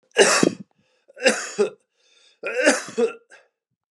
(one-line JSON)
{"three_cough_length": "3.9 s", "three_cough_amplitude": 31049, "three_cough_signal_mean_std_ratio": 0.42, "survey_phase": "beta (2021-08-13 to 2022-03-07)", "age": "45-64", "gender": "Male", "wearing_mask": "No", "symptom_cough_any": true, "symptom_runny_or_blocked_nose": true, "symptom_fever_high_temperature": true, "symptom_headache": true, "smoker_status": "Ex-smoker", "respiratory_condition_asthma": false, "respiratory_condition_other": false, "recruitment_source": "Test and Trace", "submission_delay": "2 days", "covid_test_result": "Positive", "covid_test_method": "LFT"}